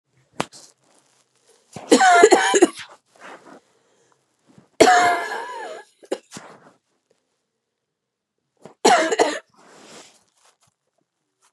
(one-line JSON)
{"three_cough_length": "11.5 s", "three_cough_amplitude": 32768, "three_cough_signal_mean_std_ratio": 0.32, "survey_phase": "beta (2021-08-13 to 2022-03-07)", "age": "45-64", "gender": "Female", "wearing_mask": "No", "symptom_cough_any": true, "symptom_runny_or_blocked_nose": true, "symptom_fatigue": true, "symptom_headache": true, "symptom_onset": "1 day", "smoker_status": "Never smoked", "respiratory_condition_asthma": true, "respiratory_condition_other": false, "recruitment_source": "Test and Trace", "submission_delay": "0 days", "covid_test_result": "Negative", "covid_test_method": "RT-qPCR"}